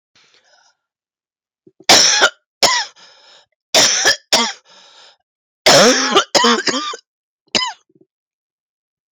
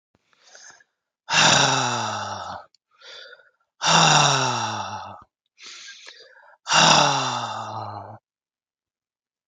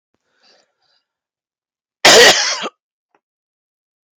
{"three_cough_length": "9.1 s", "three_cough_amplitude": 32768, "three_cough_signal_mean_std_ratio": 0.42, "exhalation_length": "9.5 s", "exhalation_amplitude": 25373, "exhalation_signal_mean_std_ratio": 0.47, "cough_length": "4.2 s", "cough_amplitude": 32768, "cough_signal_mean_std_ratio": 0.29, "survey_phase": "beta (2021-08-13 to 2022-03-07)", "age": "45-64", "gender": "Female", "wearing_mask": "No", "symptom_cough_any": true, "symptom_new_continuous_cough": true, "symptom_runny_or_blocked_nose": true, "symptom_sore_throat": true, "symptom_fever_high_temperature": true, "symptom_headache": true, "symptom_onset": "2 days", "smoker_status": "Never smoked", "respiratory_condition_asthma": false, "respiratory_condition_other": false, "recruitment_source": "Test and Trace", "submission_delay": "2 days", "covid_test_result": "Positive", "covid_test_method": "RT-qPCR", "covid_ct_value": 12.2, "covid_ct_gene": "ORF1ab gene", "covid_ct_mean": 12.4, "covid_viral_load": "84000000 copies/ml", "covid_viral_load_category": "High viral load (>1M copies/ml)"}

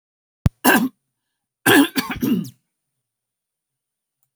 {"cough_length": "4.4 s", "cough_amplitude": 27928, "cough_signal_mean_std_ratio": 0.34, "survey_phase": "alpha (2021-03-01 to 2021-08-12)", "age": "65+", "gender": "Female", "wearing_mask": "No", "symptom_none": true, "smoker_status": "Ex-smoker", "respiratory_condition_asthma": false, "respiratory_condition_other": false, "recruitment_source": "REACT", "submission_delay": "2 days", "covid_test_result": "Negative", "covid_test_method": "RT-qPCR"}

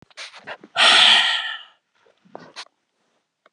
{"exhalation_length": "3.5 s", "exhalation_amplitude": 28824, "exhalation_signal_mean_std_ratio": 0.38, "survey_phase": "alpha (2021-03-01 to 2021-08-12)", "age": "65+", "gender": "Female", "wearing_mask": "No", "symptom_none": true, "smoker_status": "Ex-smoker", "respiratory_condition_asthma": false, "respiratory_condition_other": false, "recruitment_source": "REACT", "submission_delay": "2 days", "covid_test_result": "Negative", "covid_test_method": "RT-qPCR"}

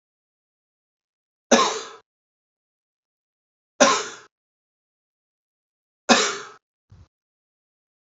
{"three_cough_length": "8.1 s", "three_cough_amplitude": 29785, "three_cough_signal_mean_std_ratio": 0.23, "survey_phase": "alpha (2021-03-01 to 2021-08-12)", "age": "65+", "gender": "Male", "wearing_mask": "No", "symptom_none": true, "smoker_status": "Ex-smoker", "respiratory_condition_asthma": false, "respiratory_condition_other": false, "recruitment_source": "REACT", "submission_delay": "2 days", "covid_test_result": "Negative", "covid_test_method": "RT-qPCR"}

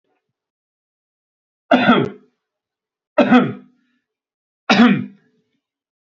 {"three_cough_length": "6.1 s", "three_cough_amplitude": 32768, "three_cough_signal_mean_std_ratio": 0.32, "survey_phase": "beta (2021-08-13 to 2022-03-07)", "age": "18-44", "gender": "Male", "wearing_mask": "No", "symptom_none": true, "symptom_onset": "12 days", "smoker_status": "Never smoked", "respiratory_condition_asthma": true, "respiratory_condition_other": false, "recruitment_source": "REACT", "submission_delay": "1 day", "covid_test_result": "Negative", "covid_test_method": "RT-qPCR"}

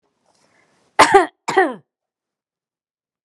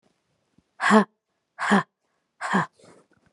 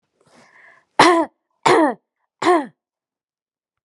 {"cough_length": "3.2 s", "cough_amplitude": 32768, "cough_signal_mean_std_ratio": 0.27, "exhalation_length": "3.3 s", "exhalation_amplitude": 27363, "exhalation_signal_mean_std_ratio": 0.33, "three_cough_length": "3.8 s", "three_cough_amplitude": 32767, "three_cough_signal_mean_std_ratio": 0.34, "survey_phase": "beta (2021-08-13 to 2022-03-07)", "age": "45-64", "gender": "Female", "wearing_mask": "No", "symptom_runny_or_blocked_nose": true, "symptom_sore_throat": true, "symptom_fatigue": true, "symptom_headache": true, "symptom_onset": "2 days", "smoker_status": "Never smoked", "respiratory_condition_asthma": false, "respiratory_condition_other": false, "recruitment_source": "Test and Trace", "submission_delay": "2 days", "covid_test_result": "Positive", "covid_test_method": "RT-qPCR", "covid_ct_value": 23.7, "covid_ct_gene": "ORF1ab gene", "covid_ct_mean": 24.9, "covid_viral_load": "7100 copies/ml", "covid_viral_load_category": "Minimal viral load (< 10K copies/ml)"}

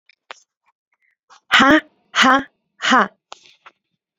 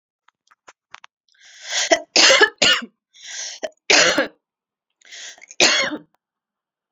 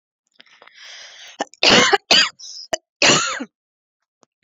{"exhalation_length": "4.2 s", "exhalation_amplitude": 32767, "exhalation_signal_mean_std_ratio": 0.35, "three_cough_length": "6.9 s", "three_cough_amplitude": 32358, "three_cough_signal_mean_std_ratio": 0.38, "cough_length": "4.4 s", "cough_amplitude": 31460, "cough_signal_mean_std_ratio": 0.38, "survey_phase": "alpha (2021-03-01 to 2021-08-12)", "age": "18-44", "gender": "Female", "wearing_mask": "No", "symptom_none": true, "smoker_status": "Ex-smoker", "respiratory_condition_asthma": false, "respiratory_condition_other": false, "recruitment_source": "REACT", "submission_delay": "1 day", "covid_test_result": "Negative", "covid_test_method": "RT-qPCR"}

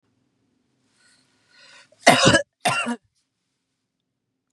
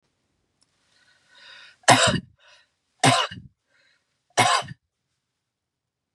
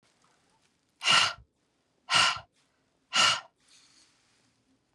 {"cough_length": "4.5 s", "cough_amplitude": 32107, "cough_signal_mean_std_ratio": 0.27, "three_cough_length": "6.1 s", "three_cough_amplitude": 30531, "three_cough_signal_mean_std_ratio": 0.28, "exhalation_length": "4.9 s", "exhalation_amplitude": 12318, "exhalation_signal_mean_std_ratio": 0.32, "survey_phase": "beta (2021-08-13 to 2022-03-07)", "age": "45-64", "gender": "Female", "wearing_mask": "No", "symptom_cough_any": true, "symptom_headache": true, "smoker_status": "Never smoked", "respiratory_condition_asthma": false, "respiratory_condition_other": false, "recruitment_source": "Test and Trace", "submission_delay": "2 days", "covid_test_result": "Negative", "covid_test_method": "RT-qPCR"}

